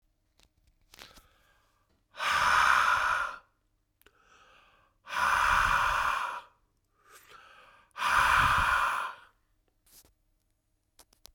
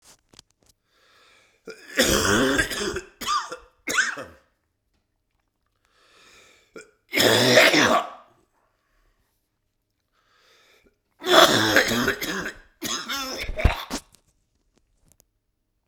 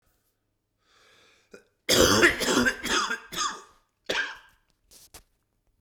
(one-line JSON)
{"exhalation_length": "11.3 s", "exhalation_amplitude": 10958, "exhalation_signal_mean_std_ratio": 0.48, "three_cough_length": "15.9 s", "three_cough_amplitude": 32767, "three_cough_signal_mean_std_ratio": 0.4, "cough_length": "5.8 s", "cough_amplitude": 19445, "cough_signal_mean_std_ratio": 0.4, "survey_phase": "beta (2021-08-13 to 2022-03-07)", "age": "45-64", "gender": "Male", "wearing_mask": "No", "symptom_cough_any": true, "symptom_runny_or_blocked_nose": true, "symptom_sore_throat": true, "symptom_fatigue": true, "symptom_fever_high_temperature": true, "symptom_headache": true, "symptom_onset": "9 days", "smoker_status": "Never smoked", "respiratory_condition_asthma": false, "respiratory_condition_other": false, "recruitment_source": "Test and Trace", "submission_delay": "1 day", "covid_test_result": "Positive", "covid_test_method": "RT-qPCR", "covid_ct_value": 14.8, "covid_ct_gene": "ORF1ab gene", "covid_ct_mean": 16.0, "covid_viral_load": "5500000 copies/ml", "covid_viral_load_category": "High viral load (>1M copies/ml)"}